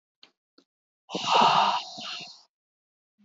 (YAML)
exhalation_length: 3.2 s
exhalation_amplitude: 14645
exhalation_signal_mean_std_ratio: 0.4
survey_phase: beta (2021-08-13 to 2022-03-07)
age: 18-44
gender: Female
wearing_mask: 'No'
symptom_headache: true
smoker_status: Never smoked
respiratory_condition_asthma: false
respiratory_condition_other: false
recruitment_source: REACT
submission_delay: 0 days
covid_test_result: Negative
covid_test_method: RT-qPCR
influenza_a_test_result: Negative
influenza_b_test_result: Negative